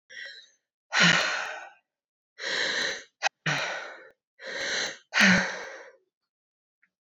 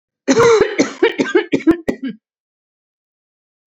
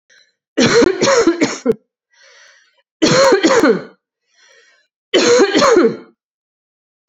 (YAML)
exhalation_length: 7.2 s
exhalation_amplitude: 15008
exhalation_signal_mean_std_ratio: 0.45
cough_length: 3.7 s
cough_amplitude: 29811
cough_signal_mean_std_ratio: 0.46
three_cough_length: 7.1 s
three_cough_amplitude: 31326
three_cough_signal_mean_std_ratio: 0.53
survey_phase: alpha (2021-03-01 to 2021-08-12)
age: 18-44
gender: Female
wearing_mask: 'No'
symptom_cough_any: true
symptom_loss_of_taste: true
symptom_onset: 6 days
smoker_status: Ex-smoker
respiratory_condition_asthma: false
respiratory_condition_other: false
recruitment_source: Test and Trace
submission_delay: 2 days
covid_test_result: Positive
covid_test_method: RT-qPCR